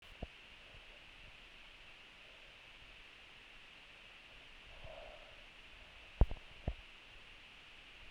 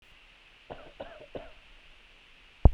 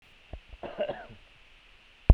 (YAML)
exhalation_length: 8.1 s
exhalation_amplitude: 6283
exhalation_signal_mean_std_ratio: 0.32
three_cough_length: 2.7 s
three_cough_amplitude: 25254
three_cough_signal_mean_std_ratio: 0.16
cough_length: 2.1 s
cough_amplitude: 22247
cough_signal_mean_std_ratio: 0.19
survey_phase: beta (2021-08-13 to 2022-03-07)
age: 18-44
gender: Male
wearing_mask: 'No'
symptom_none: true
smoker_status: Current smoker (1 to 10 cigarettes per day)
respiratory_condition_asthma: false
respiratory_condition_other: false
recruitment_source: REACT
submission_delay: 3 days
covid_test_result: Negative
covid_test_method: RT-qPCR
influenza_a_test_result: Negative
influenza_b_test_result: Negative